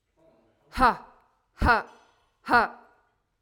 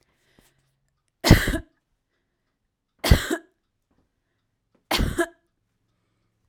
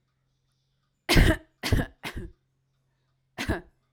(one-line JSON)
{"exhalation_length": "3.4 s", "exhalation_amplitude": 14256, "exhalation_signal_mean_std_ratio": 0.33, "three_cough_length": "6.5 s", "three_cough_amplitude": 32768, "three_cough_signal_mean_std_ratio": 0.24, "cough_length": "3.9 s", "cough_amplitude": 16957, "cough_signal_mean_std_ratio": 0.31, "survey_phase": "alpha (2021-03-01 to 2021-08-12)", "age": "18-44", "gender": "Female", "wearing_mask": "No", "symptom_none": true, "smoker_status": "Never smoked", "respiratory_condition_asthma": false, "respiratory_condition_other": false, "recruitment_source": "REACT", "submission_delay": "1 day", "covid_test_result": "Negative", "covid_test_method": "RT-qPCR"}